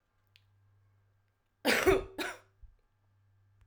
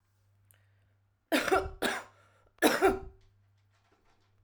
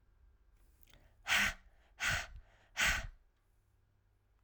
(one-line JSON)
{"cough_length": "3.7 s", "cough_amplitude": 6746, "cough_signal_mean_std_ratio": 0.29, "three_cough_length": "4.4 s", "three_cough_amplitude": 10526, "three_cough_signal_mean_std_ratio": 0.35, "exhalation_length": "4.4 s", "exhalation_amplitude": 3917, "exhalation_signal_mean_std_ratio": 0.37, "survey_phase": "alpha (2021-03-01 to 2021-08-12)", "age": "18-44", "gender": "Female", "wearing_mask": "No", "symptom_cough_any": true, "symptom_fatigue": true, "symptom_headache": true, "symptom_change_to_sense_of_smell_or_taste": true, "symptom_loss_of_taste": true, "symptom_onset": "3 days", "smoker_status": "Current smoker (11 or more cigarettes per day)", "respiratory_condition_asthma": false, "respiratory_condition_other": false, "recruitment_source": "Test and Trace", "submission_delay": "2 days", "covid_test_result": "Positive", "covid_test_method": "ePCR"}